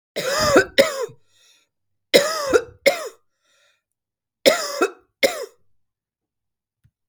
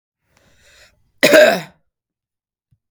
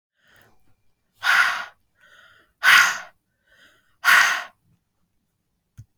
{
  "three_cough_length": "7.1 s",
  "three_cough_amplitude": 32768,
  "three_cough_signal_mean_std_ratio": 0.36,
  "cough_length": "2.9 s",
  "cough_amplitude": 32768,
  "cough_signal_mean_std_ratio": 0.28,
  "exhalation_length": "6.0 s",
  "exhalation_amplitude": 25331,
  "exhalation_signal_mean_std_ratio": 0.33,
  "survey_phase": "beta (2021-08-13 to 2022-03-07)",
  "age": "45-64",
  "gender": "Female",
  "wearing_mask": "No",
  "symptom_prefer_not_to_say": true,
  "smoker_status": "Ex-smoker",
  "respiratory_condition_asthma": false,
  "respiratory_condition_other": false,
  "recruitment_source": "REACT",
  "submission_delay": "2 days",
  "covid_test_result": "Negative",
  "covid_test_method": "RT-qPCR",
  "influenza_a_test_result": "Negative",
  "influenza_b_test_result": "Negative"
}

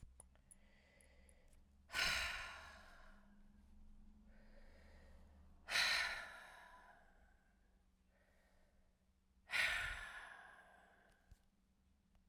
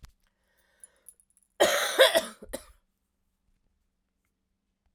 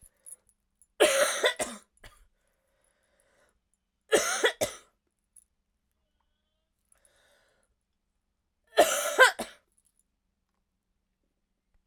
{
  "exhalation_length": "12.3 s",
  "exhalation_amplitude": 1912,
  "exhalation_signal_mean_std_ratio": 0.4,
  "cough_length": "4.9 s",
  "cough_amplitude": 16391,
  "cough_signal_mean_std_ratio": 0.26,
  "three_cough_length": "11.9 s",
  "three_cough_amplitude": 17133,
  "three_cough_signal_mean_std_ratio": 0.26,
  "survey_phase": "beta (2021-08-13 to 2022-03-07)",
  "age": "45-64",
  "gender": "Female",
  "wearing_mask": "No",
  "symptom_cough_any": true,
  "symptom_runny_or_blocked_nose": true,
  "symptom_sore_throat": true,
  "symptom_fatigue": true,
  "symptom_fever_high_temperature": true,
  "symptom_headache": true,
  "symptom_change_to_sense_of_smell_or_taste": true,
  "symptom_onset": "4 days",
  "smoker_status": "Never smoked",
  "respiratory_condition_asthma": false,
  "respiratory_condition_other": false,
  "recruitment_source": "Test and Trace",
  "submission_delay": "3 days",
  "covid_test_result": "Positive",
  "covid_test_method": "RT-qPCR",
  "covid_ct_value": 20.2,
  "covid_ct_gene": "ORF1ab gene"
}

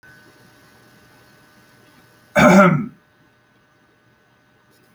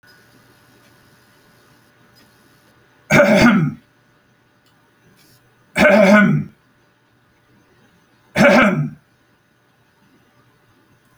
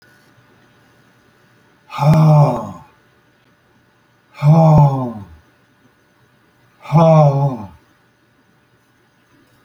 {
  "cough_length": "4.9 s",
  "cough_amplitude": 28091,
  "cough_signal_mean_std_ratio": 0.27,
  "three_cough_length": "11.2 s",
  "three_cough_amplitude": 32024,
  "three_cough_signal_mean_std_ratio": 0.34,
  "exhalation_length": "9.6 s",
  "exhalation_amplitude": 28140,
  "exhalation_signal_mean_std_ratio": 0.4,
  "survey_phase": "alpha (2021-03-01 to 2021-08-12)",
  "age": "65+",
  "gender": "Male",
  "wearing_mask": "No",
  "symptom_none": true,
  "smoker_status": "Ex-smoker",
  "respiratory_condition_asthma": false,
  "respiratory_condition_other": false,
  "recruitment_source": "REACT",
  "submission_delay": "2 days",
  "covid_test_result": "Negative",
  "covid_test_method": "RT-qPCR"
}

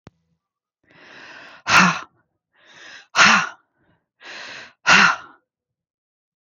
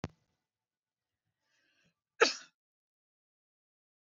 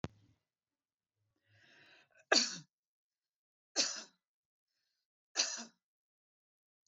{
  "exhalation_length": "6.4 s",
  "exhalation_amplitude": 31629,
  "exhalation_signal_mean_std_ratio": 0.32,
  "cough_length": "4.1 s",
  "cough_amplitude": 11485,
  "cough_signal_mean_std_ratio": 0.13,
  "three_cough_length": "6.9 s",
  "three_cough_amplitude": 6533,
  "three_cough_signal_mean_std_ratio": 0.22,
  "survey_phase": "beta (2021-08-13 to 2022-03-07)",
  "age": "45-64",
  "gender": "Female",
  "wearing_mask": "No",
  "symptom_none": true,
  "smoker_status": "Ex-smoker",
  "respiratory_condition_asthma": false,
  "respiratory_condition_other": false,
  "recruitment_source": "REACT",
  "submission_delay": "2 days",
  "covid_test_result": "Negative",
  "covid_test_method": "RT-qPCR"
}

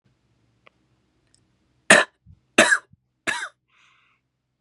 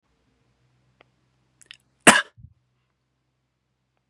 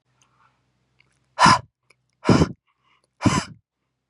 {
  "three_cough_length": "4.6 s",
  "three_cough_amplitude": 32768,
  "three_cough_signal_mean_std_ratio": 0.22,
  "cough_length": "4.1 s",
  "cough_amplitude": 32768,
  "cough_signal_mean_std_ratio": 0.13,
  "exhalation_length": "4.1 s",
  "exhalation_amplitude": 29433,
  "exhalation_signal_mean_std_ratio": 0.29,
  "survey_phase": "beta (2021-08-13 to 2022-03-07)",
  "age": "18-44",
  "gender": "Male",
  "wearing_mask": "No",
  "symptom_cough_any": true,
  "symptom_sore_throat": true,
  "symptom_fatigue": true,
  "symptom_onset": "5 days",
  "smoker_status": "Ex-smoker",
  "respiratory_condition_asthma": false,
  "respiratory_condition_other": false,
  "recruitment_source": "Test and Trace",
  "submission_delay": "3 days",
  "covid_test_result": "Positive",
  "covid_test_method": "RT-qPCR",
  "covid_ct_value": 26.3,
  "covid_ct_gene": "ORF1ab gene"
}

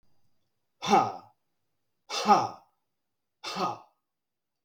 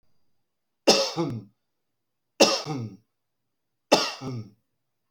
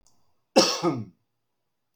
{
  "exhalation_length": "4.6 s",
  "exhalation_amplitude": 13348,
  "exhalation_signal_mean_std_ratio": 0.32,
  "three_cough_length": "5.1 s",
  "three_cough_amplitude": 21450,
  "three_cough_signal_mean_std_ratio": 0.33,
  "cough_length": "2.0 s",
  "cough_amplitude": 16996,
  "cough_signal_mean_std_ratio": 0.34,
  "survey_phase": "beta (2021-08-13 to 2022-03-07)",
  "age": "45-64",
  "gender": "Male",
  "wearing_mask": "No",
  "symptom_none": true,
  "smoker_status": "Ex-smoker",
  "respiratory_condition_asthma": false,
  "respiratory_condition_other": false,
  "recruitment_source": "REACT",
  "submission_delay": "2 days",
  "covid_test_result": "Negative",
  "covid_test_method": "RT-qPCR"
}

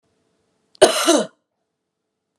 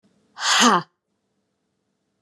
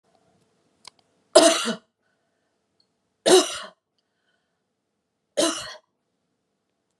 {
  "cough_length": "2.4 s",
  "cough_amplitude": 32768,
  "cough_signal_mean_std_ratio": 0.3,
  "exhalation_length": "2.2 s",
  "exhalation_amplitude": 25088,
  "exhalation_signal_mean_std_ratio": 0.34,
  "three_cough_length": "7.0 s",
  "three_cough_amplitude": 32048,
  "three_cough_signal_mean_std_ratio": 0.25,
  "survey_phase": "beta (2021-08-13 to 2022-03-07)",
  "age": "45-64",
  "gender": "Female",
  "wearing_mask": "No",
  "symptom_abdominal_pain": true,
  "symptom_fatigue": true,
  "symptom_onset": "12 days",
  "smoker_status": "Ex-smoker",
  "respiratory_condition_asthma": false,
  "respiratory_condition_other": false,
  "recruitment_source": "REACT",
  "submission_delay": "1 day",
  "covid_test_result": "Negative",
  "covid_test_method": "RT-qPCR"
}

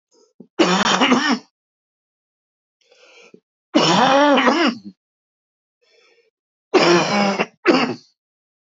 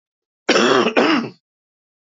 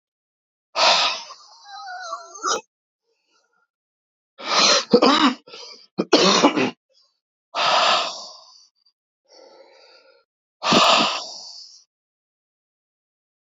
{
  "three_cough_length": "8.8 s",
  "three_cough_amplitude": 29348,
  "three_cough_signal_mean_std_ratio": 0.46,
  "cough_length": "2.1 s",
  "cough_amplitude": 27693,
  "cough_signal_mean_std_ratio": 0.5,
  "exhalation_length": "13.5 s",
  "exhalation_amplitude": 26987,
  "exhalation_signal_mean_std_ratio": 0.41,
  "survey_phase": "beta (2021-08-13 to 2022-03-07)",
  "age": "45-64",
  "gender": "Male",
  "wearing_mask": "No",
  "symptom_cough_any": true,
  "symptom_new_continuous_cough": true,
  "symptom_runny_or_blocked_nose": true,
  "symptom_sore_throat": true,
  "symptom_fatigue": true,
  "symptom_fever_high_temperature": true,
  "symptom_headache": true,
  "symptom_change_to_sense_of_smell_or_taste": true,
  "symptom_loss_of_taste": true,
  "symptom_onset": "5 days",
  "smoker_status": "Never smoked",
  "respiratory_condition_asthma": false,
  "respiratory_condition_other": false,
  "recruitment_source": "Test and Trace",
  "submission_delay": "2 days",
  "covid_test_result": "Positive",
  "covid_test_method": "RT-qPCR"
}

